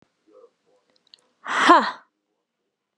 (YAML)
exhalation_length: 3.0 s
exhalation_amplitude: 32125
exhalation_signal_mean_std_ratio: 0.27
survey_phase: beta (2021-08-13 to 2022-03-07)
age: 45-64
gender: Female
wearing_mask: 'No'
symptom_fatigue: true
symptom_headache: true
symptom_onset: 13 days
smoker_status: Never smoked
respiratory_condition_asthma: true
respiratory_condition_other: false
recruitment_source: REACT
submission_delay: 2 days
covid_test_result: Negative
covid_test_method: RT-qPCR
influenza_a_test_result: Negative
influenza_b_test_result: Negative